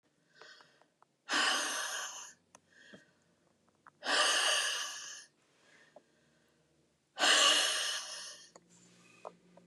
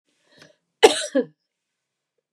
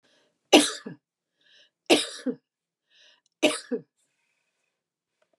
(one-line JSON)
{"exhalation_length": "9.7 s", "exhalation_amplitude": 6654, "exhalation_signal_mean_std_ratio": 0.44, "cough_length": "2.3 s", "cough_amplitude": 32768, "cough_signal_mean_std_ratio": 0.22, "three_cough_length": "5.4 s", "three_cough_amplitude": 28728, "three_cough_signal_mean_std_ratio": 0.24, "survey_phase": "beta (2021-08-13 to 2022-03-07)", "age": "65+", "gender": "Female", "wearing_mask": "No", "symptom_sore_throat": true, "smoker_status": "Ex-smoker", "respiratory_condition_asthma": false, "respiratory_condition_other": false, "recruitment_source": "REACT", "submission_delay": "3 days", "covid_test_result": "Negative", "covid_test_method": "RT-qPCR", "influenza_a_test_result": "Negative", "influenza_b_test_result": "Negative"}